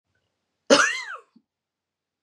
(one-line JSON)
{"cough_length": "2.2 s", "cough_amplitude": 27351, "cough_signal_mean_std_ratio": 0.27, "survey_phase": "beta (2021-08-13 to 2022-03-07)", "age": "18-44", "gender": "Female", "wearing_mask": "No", "symptom_new_continuous_cough": true, "symptom_runny_or_blocked_nose": true, "symptom_shortness_of_breath": true, "symptom_fatigue": true, "symptom_headache": true, "symptom_onset": "3 days", "smoker_status": "Never smoked", "respiratory_condition_asthma": false, "respiratory_condition_other": false, "recruitment_source": "REACT", "submission_delay": "1 day", "covid_test_result": "Positive", "covid_test_method": "RT-qPCR", "covid_ct_value": 22.6, "covid_ct_gene": "E gene", "influenza_a_test_result": "Negative", "influenza_b_test_result": "Negative"}